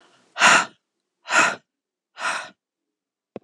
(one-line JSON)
{"exhalation_length": "3.4 s", "exhalation_amplitude": 25494, "exhalation_signal_mean_std_ratio": 0.34, "survey_phase": "alpha (2021-03-01 to 2021-08-12)", "age": "45-64", "gender": "Female", "wearing_mask": "No", "symptom_cough_any": true, "symptom_fatigue": true, "smoker_status": "Never smoked", "respiratory_condition_asthma": false, "respiratory_condition_other": true, "recruitment_source": "Test and Trace", "submission_delay": "1 day", "covid_test_result": "Positive", "covid_test_method": "RT-qPCR", "covid_ct_value": 33.2, "covid_ct_gene": "N gene"}